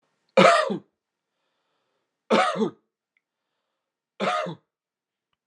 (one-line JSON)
{"cough_length": "5.5 s", "cough_amplitude": 22749, "cough_signal_mean_std_ratio": 0.32, "survey_phase": "beta (2021-08-13 to 2022-03-07)", "age": "45-64", "gender": "Male", "wearing_mask": "No", "symptom_none": true, "smoker_status": "Ex-smoker", "respiratory_condition_asthma": false, "respiratory_condition_other": false, "recruitment_source": "REACT", "submission_delay": "1 day", "covid_test_result": "Negative", "covid_test_method": "RT-qPCR"}